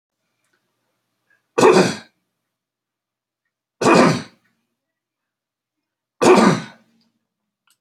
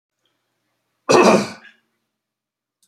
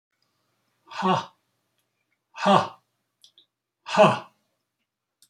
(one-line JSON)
{"three_cough_length": "7.8 s", "three_cough_amplitude": 32768, "three_cough_signal_mean_std_ratio": 0.3, "cough_length": "2.9 s", "cough_amplitude": 28640, "cough_signal_mean_std_ratio": 0.29, "exhalation_length": "5.3 s", "exhalation_amplitude": 23055, "exhalation_signal_mean_std_ratio": 0.28, "survey_phase": "beta (2021-08-13 to 2022-03-07)", "age": "65+", "gender": "Male", "wearing_mask": "No", "symptom_none": true, "smoker_status": "Never smoked", "respiratory_condition_asthma": false, "respiratory_condition_other": false, "recruitment_source": "REACT", "submission_delay": "0 days", "covid_test_result": "Negative", "covid_test_method": "RT-qPCR", "influenza_a_test_result": "Negative", "influenza_b_test_result": "Negative"}